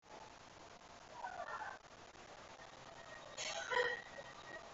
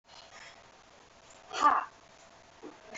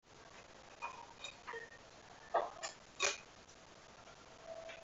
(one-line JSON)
{"cough_length": "4.7 s", "cough_amplitude": 2090, "cough_signal_mean_std_ratio": 0.6, "exhalation_length": "3.0 s", "exhalation_amplitude": 7000, "exhalation_signal_mean_std_ratio": 0.31, "three_cough_length": "4.8 s", "three_cough_amplitude": 3001, "three_cough_signal_mean_std_ratio": 0.46, "survey_phase": "beta (2021-08-13 to 2022-03-07)", "age": "18-44", "gender": "Female", "wearing_mask": "No", "symptom_none": true, "smoker_status": "Never smoked", "respiratory_condition_asthma": false, "respiratory_condition_other": false, "recruitment_source": "REACT", "submission_delay": "1 day", "covid_test_result": "Negative", "covid_test_method": "RT-qPCR", "influenza_a_test_result": "Negative", "influenza_b_test_result": "Negative"}